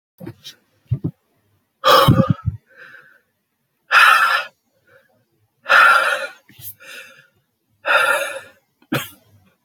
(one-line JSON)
{"exhalation_length": "9.6 s", "exhalation_amplitude": 29204, "exhalation_signal_mean_std_ratio": 0.4, "survey_phase": "beta (2021-08-13 to 2022-03-07)", "age": "18-44", "gender": "Male", "wearing_mask": "No", "symptom_cough_any": true, "symptom_runny_or_blocked_nose": true, "symptom_sore_throat": true, "symptom_onset": "4 days", "smoker_status": "Never smoked", "respiratory_condition_asthma": false, "respiratory_condition_other": false, "recruitment_source": "Test and Trace", "submission_delay": "1 day", "covid_test_result": "Positive", "covid_test_method": "RT-qPCR", "covid_ct_value": 17.6, "covid_ct_gene": "ORF1ab gene"}